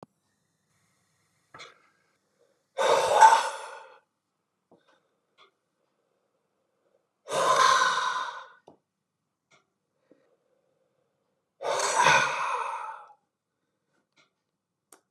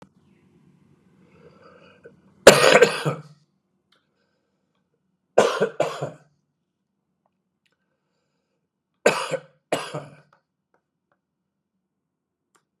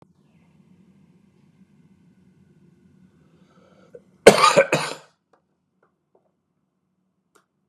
{"exhalation_length": "15.1 s", "exhalation_amplitude": 21656, "exhalation_signal_mean_std_ratio": 0.33, "three_cough_length": "12.8 s", "three_cough_amplitude": 32768, "three_cough_signal_mean_std_ratio": 0.22, "cough_length": "7.7 s", "cough_amplitude": 32768, "cough_signal_mean_std_ratio": 0.18, "survey_phase": "beta (2021-08-13 to 2022-03-07)", "age": "45-64", "gender": "Male", "wearing_mask": "No", "symptom_cough_any": true, "symptom_runny_or_blocked_nose": true, "symptom_headache": true, "smoker_status": "Never smoked", "respiratory_condition_asthma": false, "respiratory_condition_other": false, "recruitment_source": "Test and Trace", "submission_delay": "2 days", "covid_test_result": "Positive", "covid_test_method": "RT-qPCR", "covid_ct_value": 21.9, "covid_ct_gene": "ORF1ab gene"}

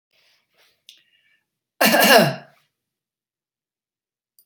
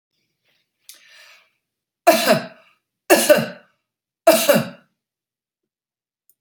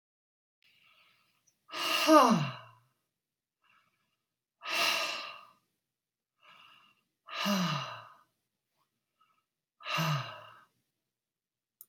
{"cough_length": "4.5 s", "cough_amplitude": 30862, "cough_signal_mean_std_ratio": 0.27, "three_cough_length": "6.4 s", "three_cough_amplitude": 31523, "three_cough_signal_mean_std_ratio": 0.31, "exhalation_length": "11.9 s", "exhalation_amplitude": 12366, "exhalation_signal_mean_std_ratio": 0.32, "survey_phase": "beta (2021-08-13 to 2022-03-07)", "age": "45-64", "gender": "Female", "wearing_mask": "No", "symptom_none": true, "smoker_status": "Never smoked", "respiratory_condition_asthma": false, "respiratory_condition_other": false, "recruitment_source": "REACT", "submission_delay": "0 days", "covid_test_result": "Negative", "covid_test_method": "RT-qPCR"}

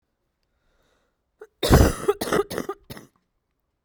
{"cough_length": "3.8 s", "cough_amplitude": 28735, "cough_signal_mean_std_ratio": 0.31, "survey_phase": "beta (2021-08-13 to 2022-03-07)", "age": "18-44", "gender": "Female", "wearing_mask": "No", "symptom_sore_throat": true, "symptom_fever_high_temperature": true, "smoker_status": "Never smoked", "respiratory_condition_asthma": false, "respiratory_condition_other": false, "recruitment_source": "Test and Trace", "submission_delay": "2 days", "covid_test_result": "Positive", "covid_test_method": "RT-qPCR", "covid_ct_value": 27.5, "covid_ct_gene": "ORF1ab gene", "covid_ct_mean": 28.2, "covid_viral_load": "540 copies/ml", "covid_viral_load_category": "Minimal viral load (< 10K copies/ml)"}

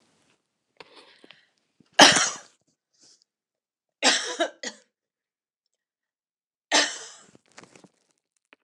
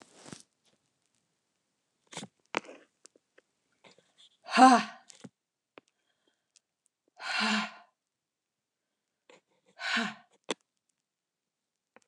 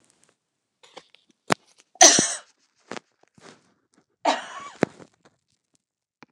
{"three_cough_length": "8.6 s", "three_cough_amplitude": 29204, "three_cough_signal_mean_std_ratio": 0.23, "exhalation_length": "12.1 s", "exhalation_amplitude": 16323, "exhalation_signal_mean_std_ratio": 0.2, "cough_length": "6.3 s", "cough_amplitude": 29204, "cough_signal_mean_std_ratio": 0.21, "survey_phase": "beta (2021-08-13 to 2022-03-07)", "age": "65+", "gender": "Female", "wearing_mask": "No", "symptom_none": true, "smoker_status": "Never smoked", "respiratory_condition_asthma": false, "respiratory_condition_other": false, "recruitment_source": "REACT", "submission_delay": "4 days", "covid_test_result": "Negative", "covid_test_method": "RT-qPCR", "influenza_a_test_result": "Negative", "influenza_b_test_result": "Negative"}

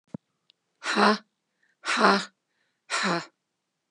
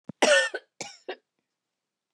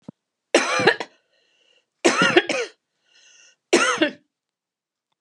{"exhalation_length": "3.9 s", "exhalation_amplitude": 21754, "exhalation_signal_mean_std_ratio": 0.38, "cough_length": "2.1 s", "cough_amplitude": 13582, "cough_signal_mean_std_ratio": 0.32, "three_cough_length": "5.2 s", "three_cough_amplitude": 32711, "three_cough_signal_mean_std_ratio": 0.38, "survey_phase": "beta (2021-08-13 to 2022-03-07)", "age": "65+", "gender": "Female", "wearing_mask": "No", "symptom_runny_or_blocked_nose": true, "smoker_status": "Ex-smoker", "respiratory_condition_asthma": false, "respiratory_condition_other": false, "recruitment_source": "REACT", "submission_delay": "1 day", "covid_test_result": "Negative", "covid_test_method": "RT-qPCR", "influenza_a_test_result": "Negative", "influenza_b_test_result": "Negative"}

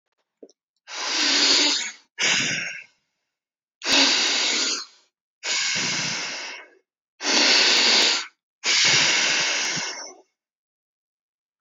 {"exhalation_length": "11.6 s", "exhalation_amplitude": 25353, "exhalation_signal_mean_std_ratio": 0.62, "survey_phase": "beta (2021-08-13 to 2022-03-07)", "age": "18-44", "gender": "Female", "wearing_mask": "No", "symptom_none": true, "smoker_status": "Never smoked", "respiratory_condition_asthma": false, "respiratory_condition_other": false, "recruitment_source": "REACT", "submission_delay": "2 days", "covid_test_result": "Negative", "covid_test_method": "RT-qPCR", "influenza_a_test_result": "Unknown/Void", "influenza_b_test_result": "Unknown/Void"}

